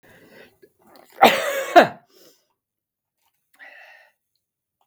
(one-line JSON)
{"cough_length": "4.9 s", "cough_amplitude": 32768, "cough_signal_mean_std_ratio": 0.23, "survey_phase": "beta (2021-08-13 to 2022-03-07)", "age": "65+", "gender": "Male", "wearing_mask": "No", "symptom_none": true, "smoker_status": "Never smoked", "respiratory_condition_asthma": false, "respiratory_condition_other": false, "recruitment_source": "REACT", "submission_delay": "2 days", "covid_test_result": "Negative", "covid_test_method": "RT-qPCR", "influenza_a_test_result": "Negative", "influenza_b_test_result": "Negative"}